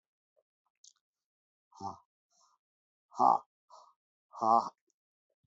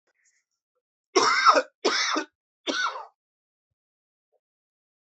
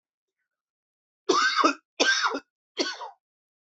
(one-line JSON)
{"exhalation_length": "5.5 s", "exhalation_amplitude": 8875, "exhalation_signal_mean_std_ratio": 0.22, "cough_length": "5.0 s", "cough_amplitude": 19231, "cough_signal_mean_std_ratio": 0.35, "three_cough_length": "3.7 s", "three_cough_amplitude": 16314, "three_cough_signal_mean_std_ratio": 0.42, "survey_phase": "alpha (2021-03-01 to 2021-08-12)", "age": "45-64", "gender": "Male", "wearing_mask": "No", "symptom_cough_any": true, "symptom_new_continuous_cough": true, "symptom_fatigue": true, "symptom_fever_high_temperature": true, "smoker_status": "Never smoked", "respiratory_condition_asthma": false, "respiratory_condition_other": false, "recruitment_source": "Test and Trace", "submission_delay": "2 days", "covid_test_result": "Positive", "covid_test_method": "LFT"}